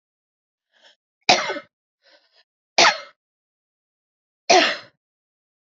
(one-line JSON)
{"three_cough_length": "5.6 s", "three_cough_amplitude": 30356, "three_cough_signal_mean_std_ratio": 0.26, "survey_phase": "beta (2021-08-13 to 2022-03-07)", "age": "45-64", "gender": "Female", "wearing_mask": "No", "symptom_none": true, "smoker_status": "Ex-smoker", "respiratory_condition_asthma": false, "respiratory_condition_other": false, "recruitment_source": "REACT", "submission_delay": "1 day", "covid_test_result": "Negative", "covid_test_method": "RT-qPCR", "influenza_a_test_result": "Negative", "influenza_b_test_result": "Negative"}